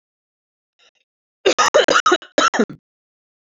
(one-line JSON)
{"cough_length": "3.6 s", "cough_amplitude": 28069, "cough_signal_mean_std_ratio": 0.36, "survey_phase": "beta (2021-08-13 to 2022-03-07)", "age": "18-44", "gender": "Female", "wearing_mask": "No", "symptom_cough_any": true, "symptom_runny_or_blocked_nose": true, "symptom_shortness_of_breath": true, "symptom_sore_throat": true, "symptom_fatigue": true, "symptom_fever_high_temperature": true, "symptom_headache": true, "smoker_status": "Never smoked", "recruitment_source": "Test and Trace", "submission_delay": "2 days", "covid_test_result": "Positive", "covid_test_method": "RT-qPCR", "covid_ct_value": 14.5, "covid_ct_gene": "ORF1ab gene"}